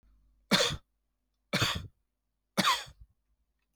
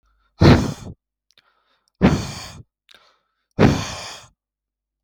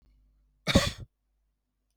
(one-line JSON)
{"three_cough_length": "3.8 s", "three_cough_amplitude": 8776, "three_cough_signal_mean_std_ratio": 0.35, "exhalation_length": "5.0 s", "exhalation_amplitude": 32768, "exhalation_signal_mean_std_ratio": 0.32, "cough_length": "2.0 s", "cough_amplitude": 13536, "cough_signal_mean_std_ratio": 0.25, "survey_phase": "beta (2021-08-13 to 2022-03-07)", "age": "45-64", "gender": "Male", "wearing_mask": "No", "symptom_none": true, "smoker_status": "Ex-smoker", "respiratory_condition_asthma": true, "respiratory_condition_other": false, "recruitment_source": "REACT", "submission_delay": "2 days", "covid_test_result": "Negative", "covid_test_method": "RT-qPCR", "influenza_a_test_result": "Negative", "influenza_b_test_result": "Negative"}